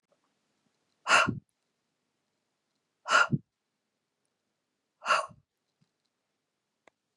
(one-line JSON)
{"exhalation_length": "7.2 s", "exhalation_amplitude": 10928, "exhalation_signal_mean_std_ratio": 0.23, "survey_phase": "beta (2021-08-13 to 2022-03-07)", "age": "45-64", "gender": "Female", "wearing_mask": "No", "symptom_fatigue": true, "symptom_onset": "2 days", "smoker_status": "Ex-smoker", "respiratory_condition_asthma": false, "respiratory_condition_other": false, "recruitment_source": "Test and Trace", "submission_delay": "1 day", "covid_test_result": "Negative", "covid_test_method": "RT-qPCR"}